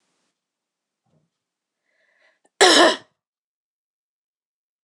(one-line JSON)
{"cough_length": "4.8 s", "cough_amplitude": 26027, "cough_signal_mean_std_ratio": 0.21, "survey_phase": "beta (2021-08-13 to 2022-03-07)", "age": "18-44", "gender": "Female", "wearing_mask": "No", "symptom_cough_any": true, "symptom_new_continuous_cough": true, "symptom_runny_or_blocked_nose": true, "symptom_shortness_of_breath": true, "symptom_sore_throat": true, "symptom_abdominal_pain": true, "symptom_fatigue": true, "symptom_fever_high_temperature": true, "symptom_headache": true, "symptom_onset": "5 days", "smoker_status": "Ex-smoker", "respiratory_condition_asthma": true, "respiratory_condition_other": false, "recruitment_source": "REACT", "submission_delay": "0 days", "covid_test_result": "Positive", "covid_test_method": "RT-qPCR", "covid_ct_value": 22.0, "covid_ct_gene": "E gene", "influenza_a_test_result": "Negative", "influenza_b_test_result": "Negative"}